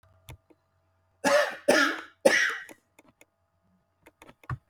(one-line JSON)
{"three_cough_length": "4.7 s", "three_cough_amplitude": 17018, "three_cough_signal_mean_std_ratio": 0.36, "survey_phase": "beta (2021-08-13 to 2022-03-07)", "age": "45-64", "gender": "Male", "wearing_mask": "No", "symptom_none": true, "smoker_status": "Ex-smoker", "respiratory_condition_asthma": true, "respiratory_condition_other": true, "recruitment_source": "REACT", "submission_delay": "1 day", "covid_test_result": "Negative", "covid_test_method": "RT-qPCR", "influenza_a_test_result": "Unknown/Void", "influenza_b_test_result": "Unknown/Void"}